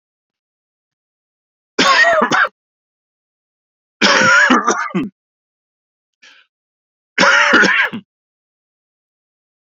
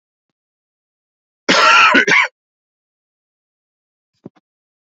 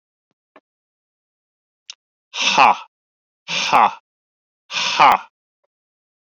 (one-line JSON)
{"three_cough_length": "9.7 s", "three_cough_amplitude": 32749, "three_cough_signal_mean_std_ratio": 0.41, "cough_length": "4.9 s", "cough_amplitude": 32172, "cough_signal_mean_std_ratio": 0.32, "exhalation_length": "6.4 s", "exhalation_amplitude": 30456, "exhalation_signal_mean_std_ratio": 0.32, "survey_phase": "alpha (2021-03-01 to 2021-08-12)", "age": "45-64", "gender": "Male", "wearing_mask": "No", "symptom_cough_any": true, "symptom_fatigue": true, "symptom_headache": true, "smoker_status": "Never smoked", "respiratory_condition_asthma": false, "respiratory_condition_other": false, "recruitment_source": "Test and Trace", "submission_delay": "1 day", "covid_test_result": "Positive", "covid_test_method": "LFT"}